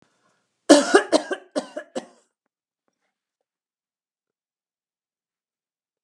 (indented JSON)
{
  "cough_length": "6.0 s",
  "cough_amplitude": 32226,
  "cough_signal_mean_std_ratio": 0.2,
  "survey_phase": "beta (2021-08-13 to 2022-03-07)",
  "age": "65+",
  "gender": "Female",
  "wearing_mask": "No",
  "symptom_none": true,
  "smoker_status": "Never smoked",
  "respiratory_condition_asthma": false,
  "respiratory_condition_other": false,
  "recruitment_source": "REACT",
  "submission_delay": "2 days",
  "covid_test_result": "Negative",
  "covid_test_method": "RT-qPCR",
  "influenza_a_test_result": "Negative",
  "influenza_b_test_result": "Negative"
}